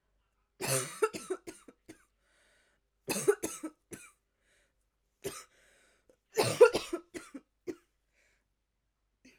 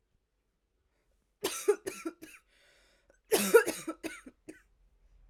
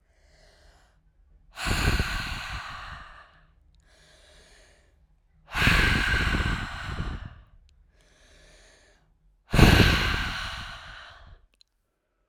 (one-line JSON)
{"three_cough_length": "9.4 s", "three_cough_amplitude": 12544, "three_cough_signal_mean_std_ratio": 0.25, "cough_length": "5.3 s", "cough_amplitude": 12820, "cough_signal_mean_std_ratio": 0.27, "exhalation_length": "12.3 s", "exhalation_amplitude": 27522, "exhalation_signal_mean_std_ratio": 0.41, "survey_phase": "alpha (2021-03-01 to 2021-08-12)", "age": "18-44", "gender": "Female", "wearing_mask": "No", "symptom_cough_any": true, "symptom_new_continuous_cough": true, "symptom_onset": "5 days", "smoker_status": "Never smoked", "respiratory_condition_asthma": false, "respiratory_condition_other": false, "recruitment_source": "Test and Trace", "submission_delay": "2 days", "covid_test_result": "Positive", "covid_test_method": "RT-qPCR", "covid_ct_value": 21.2, "covid_ct_gene": "ORF1ab gene", "covid_ct_mean": 21.6, "covid_viral_load": "85000 copies/ml", "covid_viral_load_category": "Low viral load (10K-1M copies/ml)"}